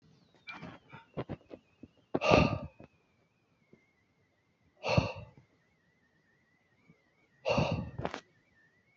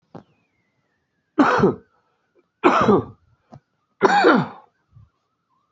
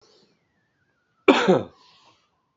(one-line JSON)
{"exhalation_length": "9.0 s", "exhalation_amplitude": 15585, "exhalation_signal_mean_std_ratio": 0.3, "three_cough_length": "5.7 s", "three_cough_amplitude": 31141, "three_cough_signal_mean_std_ratio": 0.37, "cough_length": "2.6 s", "cough_amplitude": 27720, "cough_signal_mean_std_ratio": 0.26, "survey_phase": "beta (2021-08-13 to 2022-03-07)", "age": "45-64", "gender": "Male", "wearing_mask": "No", "symptom_cough_any": true, "symptom_runny_or_blocked_nose": true, "symptom_sore_throat": true, "symptom_fatigue": true, "symptom_fever_high_temperature": true, "symptom_headache": true, "symptom_onset": "5 days", "smoker_status": "Current smoker (e-cigarettes or vapes only)", "respiratory_condition_asthma": false, "respiratory_condition_other": false, "recruitment_source": "Test and Trace", "submission_delay": "2 days", "covid_test_result": "Positive", "covid_test_method": "RT-qPCR", "covid_ct_value": 15.7, "covid_ct_gene": "N gene", "covid_ct_mean": 16.8, "covid_viral_load": "3200000 copies/ml", "covid_viral_load_category": "High viral load (>1M copies/ml)"}